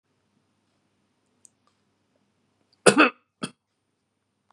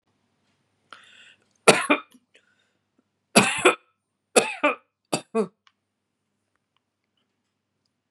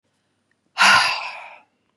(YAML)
cough_length: 4.5 s
cough_amplitude: 32550
cough_signal_mean_std_ratio: 0.16
three_cough_length: 8.1 s
three_cough_amplitude: 32103
three_cough_signal_mean_std_ratio: 0.24
exhalation_length: 2.0 s
exhalation_amplitude: 27243
exhalation_signal_mean_std_ratio: 0.39
survey_phase: beta (2021-08-13 to 2022-03-07)
age: 45-64
gender: Female
wearing_mask: 'No'
symptom_none: true
smoker_status: Ex-smoker
respiratory_condition_asthma: false
respiratory_condition_other: false
recruitment_source: REACT
submission_delay: 0 days
covid_test_result: Negative
covid_test_method: RT-qPCR